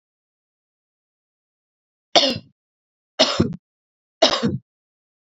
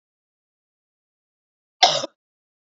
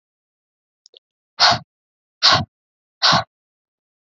{
  "three_cough_length": "5.4 s",
  "three_cough_amplitude": 32380,
  "three_cough_signal_mean_std_ratio": 0.28,
  "cough_length": "2.7 s",
  "cough_amplitude": 27198,
  "cough_signal_mean_std_ratio": 0.18,
  "exhalation_length": "4.0 s",
  "exhalation_amplitude": 30980,
  "exhalation_signal_mean_std_ratio": 0.3,
  "survey_phase": "beta (2021-08-13 to 2022-03-07)",
  "age": "18-44",
  "gender": "Female",
  "wearing_mask": "No",
  "symptom_runny_or_blocked_nose": true,
  "smoker_status": "Never smoked",
  "respiratory_condition_asthma": false,
  "respiratory_condition_other": false,
  "recruitment_source": "Test and Trace",
  "submission_delay": "2 days",
  "covid_test_result": "Positive",
  "covid_test_method": "RT-qPCR",
  "covid_ct_value": 24.3,
  "covid_ct_gene": "N gene",
  "covid_ct_mean": 25.3,
  "covid_viral_load": "5100 copies/ml",
  "covid_viral_load_category": "Minimal viral load (< 10K copies/ml)"
}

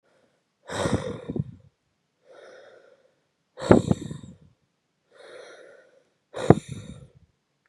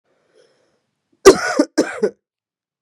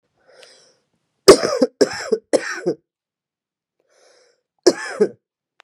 {
  "exhalation_length": "7.7 s",
  "exhalation_amplitude": 32768,
  "exhalation_signal_mean_std_ratio": 0.24,
  "cough_length": "2.8 s",
  "cough_amplitude": 32768,
  "cough_signal_mean_std_ratio": 0.28,
  "three_cough_length": "5.6 s",
  "three_cough_amplitude": 32768,
  "three_cough_signal_mean_std_ratio": 0.28,
  "survey_phase": "beta (2021-08-13 to 2022-03-07)",
  "age": "45-64",
  "gender": "Female",
  "wearing_mask": "No",
  "symptom_cough_any": true,
  "symptom_runny_or_blocked_nose": true,
  "symptom_sore_throat": true,
  "symptom_fatigue": true,
  "symptom_headache": true,
  "smoker_status": "Never smoked",
  "respiratory_condition_asthma": false,
  "respiratory_condition_other": false,
  "recruitment_source": "Test and Trace",
  "submission_delay": "-1 day",
  "covid_test_result": "Negative",
  "covid_test_method": "LFT"
}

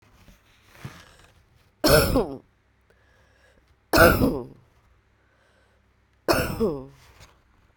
{
  "three_cough_length": "7.8 s",
  "three_cough_amplitude": 32768,
  "three_cough_signal_mean_std_ratio": 0.33,
  "survey_phase": "beta (2021-08-13 to 2022-03-07)",
  "age": "45-64",
  "gender": "Female",
  "wearing_mask": "No",
  "symptom_cough_any": true,
  "symptom_runny_or_blocked_nose": true,
  "symptom_sore_throat": true,
  "symptom_change_to_sense_of_smell_or_taste": true,
  "symptom_onset": "4 days",
  "smoker_status": "Never smoked",
  "respiratory_condition_asthma": false,
  "respiratory_condition_other": false,
  "recruitment_source": "Test and Trace",
  "submission_delay": "2 days",
  "covid_test_result": "Positive",
  "covid_test_method": "RT-qPCR",
  "covid_ct_value": 20.9,
  "covid_ct_gene": "ORF1ab gene"
}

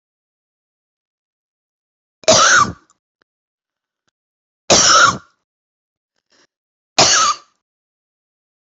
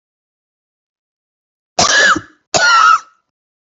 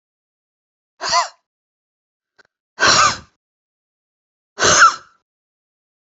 {
  "three_cough_length": "8.7 s",
  "three_cough_amplitude": 32768,
  "three_cough_signal_mean_std_ratio": 0.31,
  "cough_length": "3.7 s",
  "cough_amplitude": 32768,
  "cough_signal_mean_std_ratio": 0.42,
  "exhalation_length": "6.1 s",
  "exhalation_amplitude": 32590,
  "exhalation_signal_mean_std_ratio": 0.3,
  "survey_phase": "beta (2021-08-13 to 2022-03-07)",
  "age": "45-64",
  "gender": "Female",
  "wearing_mask": "No",
  "symptom_cough_any": true,
  "symptom_fatigue": true,
  "smoker_status": "Never smoked",
  "respiratory_condition_asthma": true,
  "respiratory_condition_other": false,
  "recruitment_source": "REACT",
  "submission_delay": "1 day",
  "covid_test_result": "Negative",
  "covid_test_method": "RT-qPCR"
}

